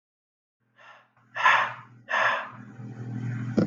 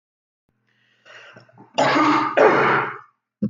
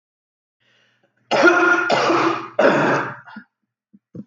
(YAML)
exhalation_length: 3.7 s
exhalation_amplitude: 15696
exhalation_signal_mean_std_ratio: 0.49
cough_length: 3.5 s
cough_amplitude: 25934
cough_signal_mean_std_ratio: 0.5
three_cough_length: 4.3 s
three_cough_amplitude: 26705
three_cough_signal_mean_std_ratio: 0.54
survey_phase: beta (2021-08-13 to 2022-03-07)
age: 18-44
gender: Male
wearing_mask: 'No'
symptom_sore_throat: true
smoker_status: Never smoked
respiratory_condition_asthma: false
respiratory_condition_other: false
recruitment_source: REACT
submission_delay: 1 day
covid_test_result: Negative
covid_test_method: RT-qPCR